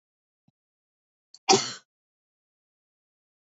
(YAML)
cough_length: 3.4 s
cough_amplitude: 19353
cough_signal_mean_std_ratio: 0.17
survey_phase: alpha (2021-03-01 to 2021-08-12)
age: 45-64
gender: Female
wearing_mask: 'No'
symptom_none: true
smoker_status: Never smoked
respiratory_condition_asthma: false
respiratory_condition_other: false
recruitment_source: REACT
submission_delay: 1 day
covid_test_result: Negative
covid_test_method: RT-qPCR